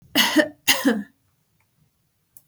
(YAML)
cough_length: 2.5 s
cough_amplitude: 32761
cough_signal_mean_std_ratio: 0.39
survey_phase: beta (2021-08-13 to 2022-03-07)
age: 65+
gender: Female
wearing_mask: 'No'
symptom_none: true
smoker_status: Never smoked
respiratory_condition_asthma: false
respiratory_condition_other: false
recruitment_source: REACT
submission_delay: 2 days
covid_test_result: Negative
covid_test_method: RT-qPCR
influenza_a_test_result: Negative
influenza_b_test_result: Negative